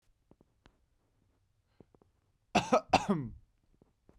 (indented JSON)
{
  "cough_length": "4.2 s",
  "cough_amplitude": 10390,
  "cough_signal_mean_std_ratio": 0.25,
  "survey_phase": "beta (2021-08-13 to 2022-03-07)",
  "age": "18-44",
  "gender": "Male",
  "wearing_mask": "No",
  "symptom_cough_any": true,
  "symptom_new_continuous_cough": true,
  "symptom_sore_throat": true,
  "symptom_fatigue": true,
  "symptom_headache": true,
  "symptom_onset": "3 days",
  "smoker_status": "Never smoked",
  "respiratory_condition_asthma": false,
  "respiratory_condition_other": false,
  "recruitment_source": "Test and Trace",
  "submission_delay": "2 days",
  "covid_test_result": "Positive",
  "covid_test_method": "RT-qPCR"
}